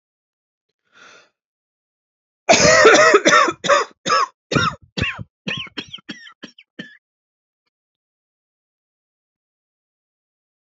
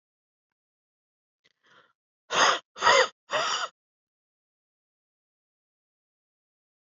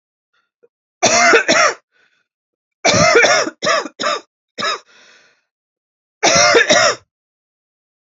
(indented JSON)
{
  "cough_length": "10.7 s",
  "cough_amplitude": 30133,
  "cough_signal_mean_std_ratio": 0.33,
  "exhalation_length": "6.8 s",
  "exhalation_amplitude": 16690,
  "exhalation_signal_mean_std_ratio": 0.26,
  "three_cough_length": "8.0 s",
  "three_cough_amplitude": 32767,
  "three_cough_signal_mean_std_ratio": 0.47,
  "survey_phase": "alpha (2021-03-01 to 2021-08-12)",
  "age": "18-44",
  "gender": "Female",
  "wearing_mask": "No",
  "symptom_cough_any": true,
  "symptom_shortness_of_breath": true,
  "symptom_fatigue": true,
  "symptom_headache": true,
  "symptom_change_to_sense_of_smell_or_taste": true,
  "symptom_loss_of_taste": true,
  "symptom_onset": "4 days",
  "smoker_status": "Ex-smoker",
  "respiratory_condition_asthma": true,
  "respiratory_condition_other": false,
  "recruitment_source": "Test and Trace",
  "submission_delay": "1 day",
  "covid_test_result": "Positive",
  "covid_test_method": "RT-qPCR",
  "covid_ct_value": 13.6,
  "covid_ct_gene": "ORF1ab gene"
}